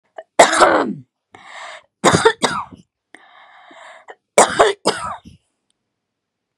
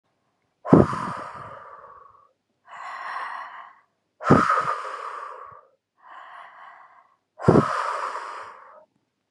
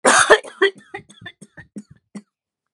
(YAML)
three_cough_length: 6.6 s
three_cough_amplitude: 32768
three_cough_signal_mean_std_ratio: 0.36
exhalation_length: 9.3 s
exhalation_amplitude: 31738
exhalation_signal_mean_std_ratio: 0.36
cough_length: 2.7 s
cough_amplitude: 32767
cough_signal_mean_std_ratio: 0.33
survey_phase: beta (2021-08-13 to 2022-03-07)
age: 45-64
gender: Female
wearing_mask: 'No'
symptom_abdominal_pain: true
smoker_status: Current smoker (e-cigarettes or vapes only)
respiratory_condition_asthma: false
respiratory_condition_other: false
recruitment_source: REACT
submission_delay: 7 days
covid_test_result: Negative
covid_test_method: RT-qPCR
influenza_a_test_result: Unknown/Void
influenza_b_test_result: Unknown/Void